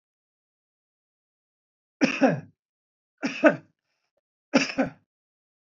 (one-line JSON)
{"three_cough_length": "5.7 s", "three_cough_amplitude": 20586, "three_cough_signal_mean_std_ratio": 0.27, "survey_phase": "beta (2021-08-13 to 2022-03-07)", "age": "45-64", "gender": "Male", "wearing_mask": "No", "symptom_none": true, "symptom_onset": "7 days", "smoker_status": "Current smoker (1 to 10 cigarettes per day)", "respiratory_condition_asthma": false, "respiratory_condition_other": false, "recruitment_source": "REACT", "submission_delay": "2 days", "covid_test_result": "Negative", "covid_test_method": "RT-qPCR"}